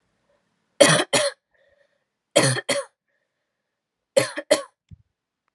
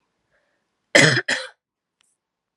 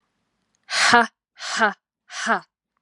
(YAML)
three_cough_length: 5.5 s
three_cough_amplitude: 31859
three_cough_signal_mean_std_ratio: 0.31
cough_length: 2.6 s
cough_amplitude: 32768
cough_signal_mean_std_ratio: 0.28
exhalation_length: 2.8 s
exhalation_amplitude: 31745
exhalation_signal_mean_std_ratio: 0.39
survey_phase: alpha (2021-03-01 to 2021-08-12)
age: 18-44
gender: Female
wearing_mask: 'No'
symptom_none: true
smoker_status: Never smoked
respiratory_condition_asthma: false
respiratory_condition_other: false
recruitment_source: Test and Trace
submission_delay: 2 days
covid_test_result: Positive
covid_test_method: RT-qPCR